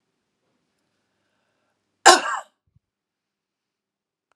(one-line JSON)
{"cough_length": "4.4 s", "cough_amplitude": 32768, "cough_signal_mean_std_ratio": 0.16, "survey_phase": "alpha (2021-03-01 to 2021-08-12)", "age": "45-64", "gender": "Female", "wearing_mask": "No", "symptom_none": true, "symptom_onset": "4 days", "smoker_status": "Never smoked", "respiratory_condition_asthma": false, "respiratory_condition_other": false, "recruitment_source": "REACT", "submission_delay": "1 day", "covid_test_result": "Negative", "covid_test_method": "RT-qPCR"}